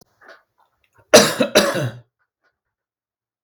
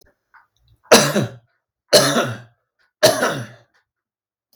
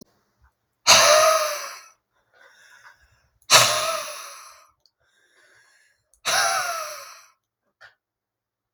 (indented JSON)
{
  "cough_length": "3.4 s",
  "cough_amplitude": 32768,
  "cough_signal_mean_std_ratio": 0.3,
  "three_cough_length": "4.6 s",
  "three_cough_amplitude": 32768,
  "three_cough_signal_mean_std_ratio": 0.36,
  "exhalation_length": "8.7 s",
  "exhalation_amplitude": 32768,
  "exhalation_signal_mean_std_ratio": 0.36,
  "survey_phase": "beta (2021-08-13 to 2022-03-07)",
  "age": "18-44",
  "gender": "Male",
  "wearing_mask": "No",
  "symptom_none": true,
  "smoker_status": "Ex-smoker",
  "respiratory_condition_asthma": true,
  "respiratory_condition_other": false,
  "recruitment_source": "REACT",
  "submission_delay": "2 days",
  "covid_test_result": "Negative",
  "covid_test_method": "RT-qPCR"
}